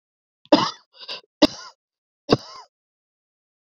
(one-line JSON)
{"three_cough_length": "3.7 s", "three_cough_amplitude": 28970, "three_cough_signal_mean_std_ratio": 0.22, "survey_phase": "beta (2021-08-13 to 2022-03-07)", "age": "45-64", "gender": "Female", "wearing_mask": "No", "symptom_cough_any": true, "symptom_runny_or_blocked_nose": true, "symptom_sore_throat": true, "symptom_diarrhoea": true, "symptom_fatigue": true, "symptom_headache": true, "smoker_status": "Ex-smoker", "respiratory_condition_asthma": false, "respiratory_condition_other": false, "recruitment_source": "Test and Trace", "submission_delay": "2 days", "covid_test_result": "Positive", "covid_test_method": "ePCR"}